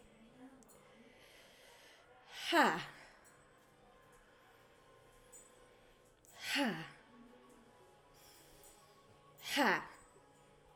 {"exhalation_length": "10.8 s", "exhalation_amplitude": 4647, "exhalation_signal_mean_std_ratio": 0.32, "survey_phase": "alpha (2021-03-01 to 2021-08-12)", "age": "18-44", "gender": "Female", "wearing_mask": "No", "symptom_none": true, "smoker_status": "Prefer not to say", "respiratory_condition_asthma": false, "respiratory_condition_other": false, "recruitment_source": "REACT", "submission_delay": "1 day", "covid_test_result": "Negative", "covid_test_method": "RT-qPCR"}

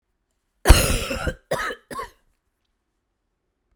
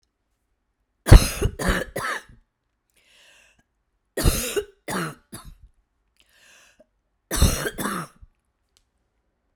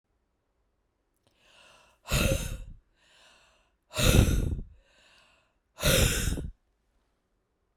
{"cough_length": "3.8 s", "cough_amplitude": 32768, "cough_signal_mean_std_ratio": 0.29, "three_cough_length": "9.6 s", "three_cough_amplitude": 32768, "three_cough_signal_mean_std_ratio": 0.26, "exhalation_length": "7.8 s", "exhalation_amplitude": 17321, "exhalation_signal_mean_std_ratio": 0.37, "survey_phase": "beta (2021-08-13 to 2022-03-07)", "age": "45-64", "gender": "Female", "wearing_mask": "No", "symptom_cough_any": true, "symptom_runny_or_blocked_nose": true, "symptom_shortness_of_breath": true, "symptom_headache": true, "symptom_onset": "3 days", "smoker_status": "Never smoked", "respiratory_condition_asthma": false, "respiratory_condition_other": false, "recruitment_source": "Test and Trace", "submission_delay": "2 days", "covid_test_result": "Positive", "covid_test_method": "ePCR"}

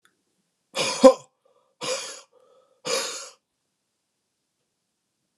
{"exhalation_length": "5.4 s", "exhalation_amplitude": 32755, "exhalation_signal_mean_std_ratio": 0.22, "survey_phase": "beta (2021-08-13 to 2022-03-07)", "age": "18-44", "gender": "Male", "wearing_mask": "No", "symptom_cough_any": true, "symptom_runny_or_blocked_nose": true, "symptom_sore_throat": true, "symptom_fatigue": true, "symptom_fever_high_temperature": true, "symptom_headache": true, "symptom_onset": "3 days", "smoker_status": "Never smoked", "respiratory_condition_asthma": false, "respiratory_condition_other": false, "recruitment_source": "Test and Trace", "submission_delay": "2 days", "covid_test_result": "Positive", "covid_test_method": "RT-qPCR", "covid_ct_value": 14.4, "covid_ct_gene": "S gene"}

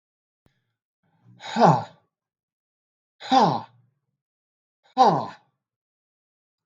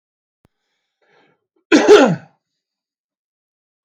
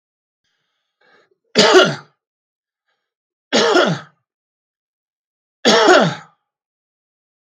{"exhalation_length": "6.7 s", "exhalation_amplitude": 22707, "exhalation_signal_mean_std_ratio": 0.28, "cough_length": "3.8 s", "cough_amplitude": 32768, "cough_signal_mean_std_ratio": 0.26, "three_cough_length": "7.4 s", "three_cough_amplitude": 32768, "three_cough_signal_mean_std_ratio": 0.34, "survey_phase": "beta (2021-08-13 to 2022-03-07)", "age": "45-64", "gender": "Male", "wearing_mask": "No", "symptom_cough_any": true, "symptom_runny_or_blocked_nose": true, "symptom_shortness_of_breath": true, "symptom_sore_throat": true, "symptom_fatigue": true, "symptom_fever_high_temperature": true, "symptom_onset": "2 days", "smoker_status": "Never smoked", "respiratory_condition_asthma": false, "respiratory_condition_other": false, "recruitment_source": "Test and Trace", "submission_delay": "2 days", "covid_test_result": "Positive", "covid_test_method": "RT-qPCR", "covid_ct_value": 14.8, "covid_ct_gene": "ORF1ab gene"}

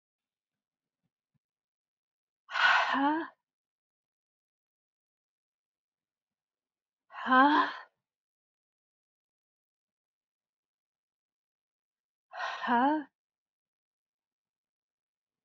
{"exhalation_length": "15.4 s", "exhalation_amplitude": 10300, "exhalation_signal_mean_std_ratio": 0.25, "survey_phase": "beta (2021-08-13 to 2022-03-07)", "age": "45-64", "gender": "Female", "wearing_mask": "No", "symptom_cough_any": true, "symptom_new_continuous_cough": true, "symptom_runny_or_blocked_nose": true, "symptom_shortness_of_breath": true, "symptom_abdominal_pain": true, "symptom_fatigue": true, "symptom_fever_high_temperature": true, "symptom_headache": true, "symptom_change_to_sense_of_smell_or_taste": true, "symptom_onset": "5 days", "smoker_status": "Never smoked", "respiratory_condition_asthma": false, "respiratory_condition_other": false, "recruitment_source": "Test and Trace", "submission_delay": "1 day", "covid_test_result": "Positive", "covid_test_method": "RT-qPCR"}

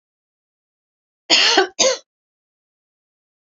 {"cough_length": "3.6 s", "cough_amplitude": 29139, "cough_signal_mean_std_ratio": 0.31, "survey_phase": "beta (2021-08-13 to 2022-03-07)", "age": "45-64", "gender": "Female", "wearing_mask": "No", "symptom_none": true, "smoker_status": "Never smoked", "respiratory_condition_asthma": false, "respiratory_condition_other": false, "recruitment_source": "REACT", "submission_delay": "0 days", "covid_test_result": "Negative", "covid_test_method": "RT-qPCR", "influenza_a_test_result": "Negative", "influenza_b_test_result": "Negative"}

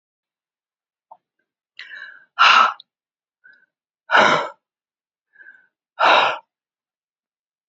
{"exhalation_length": "7.7 s", "exhalation_amplitude": 28635, "exhalation_signal_mean_std_ratio": 0.3, "survey_phase": "beta (2021-08-13 to 2022-03-07)", "age": "45-64", "gender": "Female", "wearing_mask": "No", "symptom_cough_any": true, "symptom_new_continuous_cough": true, "symptom_runny_or_blocked_nose": true, "symptom_shortness_of_breath": true, "symptom_abdominal_pain": true, "symptom_fatigue": true, "symptom_change_to_sense_of_smell_or_taste": true, "symptom_loss_of_taste": true, "symptom_onset": "8 days", "smoker_status": "Never smoked", "respiratory_condition_asthma": true, "respiratory_condition_other": false, "recruitment_source": "Test and Trace", "submission_delay": "2 days", "covid_test_result": "Positive", "covid_test_method": "RT-qPCR", "covid_ct_value": 17.3, "covid_ct_gene": "ORF1ab gene"}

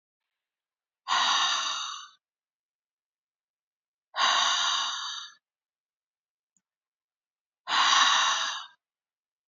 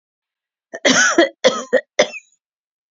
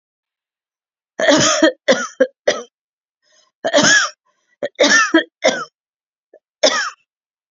{"exhalation_length": "9.5 s", "exhalation_amplitude": 12482, "exhalation_signal_mean_std_ratio": 0.44, "cough_length": "2.9 s", "cough_amplitude": 29609, "cough_signal_mean_std_ratio": 0.4, "three_cough_length": "7.5 s", "three_cough_amplitude": 32767, "three_cough_signal_mean_std_ratio": 0.43, "survey_phase": "beta (2021-08-13 to 2022-03-07)", "age": "65+", "gender": "Female", "wearing_mask": "No", "symptom_runny_or_blocked_nose": true, "symptom_fever_high_temperature": true, "symptom_other": true, "smoker_status": "Never smoked", "respiratory_condition_asthma": false, "respiratory_condition_other": false, "recruitment_source": "Test and Trace", "submission_delay": "2 days", "covid_test_result": "Positive", "covid_test_method": "RT-qPCR", "covid_ct_value": 18.6, "covid_ct_gene": "ORF1ab gene", "covid_ct_mean": 19.4, "covid_viral_load": "440000 copies/ml", "covid_viral_load_category": "Low viral load (10K-1M copies/ml)"}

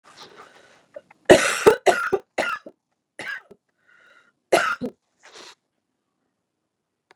{"cough_length": "7.2 s", "cough_amplitude": 32768, "cough_signal_mean_std_ratio": 0.27, "survey_phase": "beta (2021-08-13 to 2022-03-07)", "age": "45-64", "gender": "Female", "wearing_mask": "No", "symptom_none": true, "smoker_status": "Never smoked", "respiratory_condition_asthma": false, "respiratory_condition_other": false, "recruitment_source": "REACT", "submission_delay": "1 day", "covid_test_result": "Negative", "covid_test_method": "RT-qPCR", "influenza_a_test_result": "Negative", "influenza_b_test_result": "Negative"}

